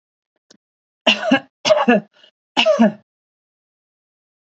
{"three_cough_length": "4.4 s", "three_cough_amplitude": 30957, "three_cough_signal_mean_std_ratio": 0.37, "survey_phase": "beta (2021-08-13 to 2022-03-07)", "age": "45-64", "gender": "Female", "wearing_mask": "No", "symptom_none": true, "smoker_status": "Never smoked", "respiratory_condition_asthma": false, "respiratory_condition_other": false, "recruitment_source": "REACT", "submission_delay": "1 day", "covid_test_result": "Negative", "covid_test_method": "RT-qPCR", "influenza_a_test_result": "Negative", "influenza_b_test_result": "Negative"}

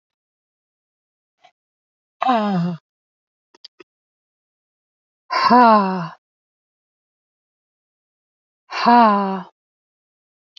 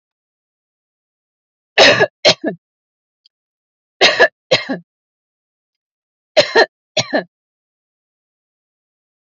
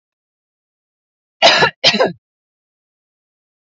{"exhalation_length": "10.6 s", "exhalation_amplitude": 32747, "exhalation_signal_mean_std_ratio": 0.31, "three_cough_length": "9.3 s", "three_cough_amplitude": 30585, "three_cough_signal_mean_std_ratio": 0.28, "cough_length": "3.8 s", "cough_amplitude": 30870, "cough_signal_mean_std_ratio": 0.29, "survey_phase": "beta (2021-08-13 to 2022-03-07)", "age": "45-64", "gender": "Female", "wearing_mask": "No", "symptom_none": true, "smoker_status": "Never smoked", "respiratory_condition_asthma": false, "respiratory_condition_other": false, "recruitment_source": "REACT", "submission_delay": "2 days", "covid_test_result": "Negative", "covid_test_method": "RT-qPCR"}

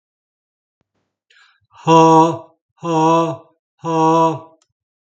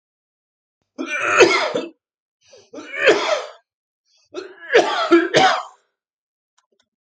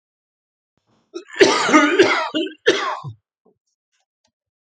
{"exhalation_length": "5.1 s", "exhalation_amplitude": 32766, "exhalation_signal_mean_std_ratio": 0.45, "three_cough_length": "7.1 s", "three_cough_amplitude": 32767, "three_cough_signal_mean_std_ratio": 0.42, "cough_length": "4.7 s", "cough_amplitude": 32767, "cough_signal_mean_std_ratio": 0.41, "survey_phase": "beta (2021-08-13 to 2022-03-07)", "age": "45-64", "gender": "Male", "wearing_mask": "No", "symptom_cough_any": true, "symptom_runny_or_blocked_nose": true, "symptom_sore_throat": true, "smoker_status": "Never smoked", "respiratory_condition_asthma": false, "respiratory_condition_other": false, "recruitment_source": "Test and Trace", "submission_delay": "1 day", "covid_test_result": "Positive", "covid_test_method": "LFT"}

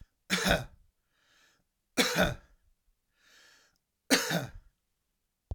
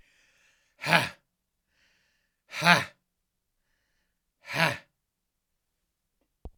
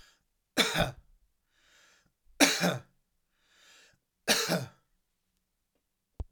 {"cough_length": "5.5 s", "cough_amplitude": 13378, "cough_signal_mean_std_ratio": 0.34, "exhalation_length": "6.6 s", "exhalation_amplitude": 30719, "exhalation_signal_mean_std_ratio": 0.22, "three_cough_length": "6.3 s", "three_cough_amplitude": 14414, "three_cough_signal_mean_std_ratio": 0.31, "survey_phase": "alpha (2021-03-01 to 2021-08-12)", "age": "45-64", "gender": "Male", "wearing_mask": "No", "symptom_headache": true, "smoker_status": "Never smoked", "respiratory_condition_asthma": false, "respiratory_condition_other": false, "recruitment_source": "Test and Trace", "submission_delay": "2 days", "covid_test_result": "Positive", "covid_test_method": "RT-qPCR", "covid_ct_value": 15.0, "covid_ct_gene": "ORF1ab gene", "covid_ct_mean": 15.3, "covid_viral_load": "9600000 copies/ml", "covid_viral_load_category": "High viral load (>1M copies/ml)"}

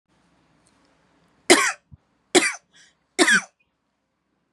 {"three_cough_length": "4.5 s", "three_cough_amplitude": 32681, "three_cough_signal_mean_std_ratio": 0.28, "survey_phase": "beta (2021-08-13 to 2022-03-07)", "age": "18-44", "gender": "Female", "wearing_mask": "No", "symptom_none": true, "smoker_status": "Ex-smoker", "respiratory_condition_asthma": false, "respiratory_condition_other": false, "recruitment_source": "REACT", "submission_delay": "1 day", "covid_test_result": "Negative", "covid_test_method": "RT-qPCR", "influenza_a_test_result": "Negative", "influenza_b_test_result": "Negative"}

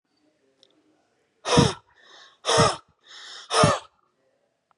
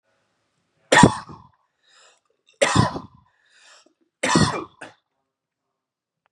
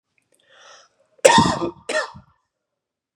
{"exhalation_length": "4.8 s", "exhalation_amplitude": 21191, "exhalation_signal_mean_std_ratio": 0.34, "three_cough_length": "6.3 s", "three_cough_amplitude": 32768, "three_cough_signal_mean_std_ratio": 0.28, "cough_length": "3.2 s", "cough_amplitude": 32768, "cough_signal_mean_std_ratio": 0.31, "survey_phase": "beta (2021-08-13 to 2022-03-07)", "age": "18-44", "gender": "Male", "wearing_mask": "No", "symptom_none": true, "smoker_status": "Never smoked", "respiratory_condition_asthma": false, "respiratory_condition_other": false, "recruitment_source": "REACT", "submission_delay": "1 day", "covid_test_result": "Negative", "covid_test_method": "RT-qPCR", "influenza_a_test_result": "Negative", "influenza_b_test_result": "Negative"}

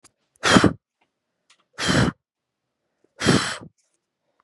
{"exhalation_length": "4.4 s", "exhalation_amplitude": 31310, "exhalation_signal_mean_std_ratio": 0.34, "survey_phase": "beta (2021-08-13 to 2022-03-07)", "age": "18-44", "gender": "Female", "wearing_mask": "No", "symptom_cough_any": true, "symptom_runny_or_blocked_nose": true, "symptom_sore_throat": true, "symptom_fatigue": true, "symptom_headache": true, "smoker_status": "Current smoker (1 to 10 cigarettes per day)", "respiratory_condition_asthma": false, "respiratory_condition_other": false, "recruitment_source": "REACT", "submission_delay": "2 days", "covid_test_result": "Positive", "covid_test_method": "RT-qPCR", "covid_ct_value": 20.0, "covid_ct_gene": "E gene", "influenza_a_test_result": "Negative", "influenza_b_test_result": "Negative"}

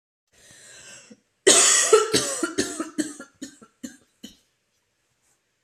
{"cough_length": "5.6 s", "cough_amplitude": 30124, "cough_signal_mean_std_ratio": 0.36, "survey_phase": "beta (2021-08-13 to 2022-03-07)", "age": "18-44", "gender": "Female", "wearing_mask": "No", "symptom_cough_any": true, "symptom_runny_or_blocked_nose": true, "symptom_fatigue": true, "symptom_headache": true, "symptom_other": true, "smoker_status": "Never smoked", "respiratory_condition_asthma": false, "respiratory_condition_other": false, "recruitment_source": "Test and Trace", "submission_delay": "2 days", "covid_test_result": "Positive", "covid_test_method": "RT-qPCR", "covid_ct_value": 19.3, "covid_ct_gene": "N gene", "covid_ct_mean": 19.9, "covid_viral_load": "300000 copies/ml", "covid_viral_load_category": "Low viral load (10K-1M copies/ml)"}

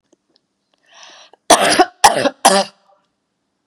{"cough_length": "3.7 s", "cough_amplitude": 32768, "cough_signal_mean_std_ratio": 0.35, "survey_phase": "beta (2021-08-13 to 2022-03-07)", "age": "45-64", "gender": "Female", "wearing_mask": "No", "symptom_runny_or_blocked_nose": true, "symptom_fatigue": true, "smoker_status": "Never smoked", "respiratory_condition_asthma": false, "respiratory_condition_other": false, "recruitment_source": "Test and Trace", "submission_delay": "2 days", "covid_test_result": "Positive", "covid_test_method": "RT-qPCR"}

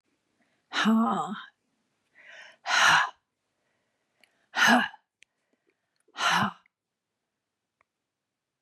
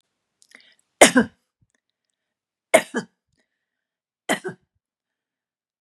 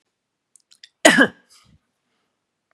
{"exhalation_length": "8.6 s", "exhalation_amplitude": 17502, "exhalation_signal_mean_std_ratio": 0.35, "three_cough_length": "5.8 s", "three_cough_amplitude": 32768, "three_cough_signal_mean_std_ratio": 0.18, "cough_length": "2.7 s", "cough_amplitude": 32768, "cough_signal_mean_std_ratio": 0.22, "survey_phase": "beta (2021-08-13 to 2022-03-07)", "age": "65+", "gender": "Female", "wearing_mask": "No", "symptom_none": true, "smoker_status": "Never smoked", "respiratory_condition_asthma": false, "respiratory_condition_other": false, "recruitment_source": "REACT", "submission_delay": "1 day", "covid_test_result": "Negative", "covid_test_method": "RT-qPCR", "influenza_a_test_result": "Negative", "influenza_b_test_result": "Negative"}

